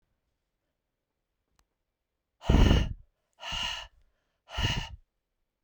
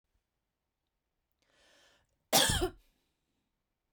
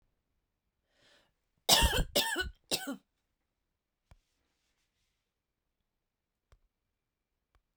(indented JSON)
{
  "exhalation_length": "5.6 s",
  "exhalation_amplitude": 12377,
  "exhalation_signal_mean_std_ratio": 0.31,
  "cough_length": "3.9 s",
  "cough_amplitude": 8775,
  "cough_signal_mean_std_ratio": 0.24,
  "three_cough_length": "7.8 s",
  "three_cough_amplitude": 15984,
  "three_cough_signal_mean_std_ratio": 0.24,
  "survey_phase": "beta (2021-08-13 to 2022-03-07)",
  "age": "45-64",
  "gender": "Female",
  "wearing_mask": "No",
  "symptom_sore_throat": true,
  "smoker_status": "Never smoked",
  "respiratory_condition_asthma": false,
  "respiratory_condition_other": false,
  "recruitment_source": "REACT",
  "submission_delay": "1 day",
  "covid_test_result": "Negative",
  "covid_test_method": "RT-qPCR",
  "influenza_a_test_result": "Negative",
  "influenza_b_test_result": "Negative"
}